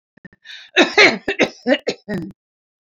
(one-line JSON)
{"cough_length": "2.8 s", "cough_amplitude": 32767, "cough_signal_mean_std_ratio": 0.4, "survey_phase": "alpha (2021-03-01 to 2021-08-12)", "age": "65+", "gender": "Female", "wearing_mask": "No", "symptom_none": true, "smoker_status": "Ex-smoker", "respiratory_condition_asthma": false, "respiratory_condition_other": false, "recruitment_source": "REACT", "submission_delay": "1 day", "covid_test_result": "Negative", "covid_test_method": "RT-qPCR"}